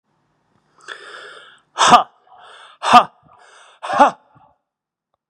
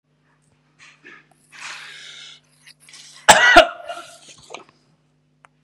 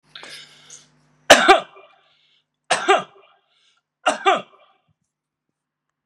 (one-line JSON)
{"exhalation_length": "5.3 s", "exhalation_amplitude": 32768, "exhalation_signal_mean_std_ratio": 0.28, "cough_length": "5.6 s", "cough_amplitude": 32768, "cough_signal_mean_std_ratio": 0.24, "three_cough_length": "6.1 s", "three_cough_amplitude": 32768, "three_cough_signal_mean_std_ratio": 0.27, "survey_phase": "beta (2021-08-13 to 2022-03-07)", "age": "65+", "gender": "Male", "wearing_mask": "No", "symptom_cough_any": true, "symptom_runny_or_blocked_nose": true, "symptom_onset": "3 days", "smoker_status": "Ex-smoker", "respiratory_condition_asthma": false, "respiratory_condition_other": false, "recruitment_source": "Test and Trace", "submission_delay": "1 day", "covid_test_result": "Positive", "covid_test_method": "RT-qPCR", "covid_ct_value": 13.5, "covid_ct_gene": "ORF1ab gene"}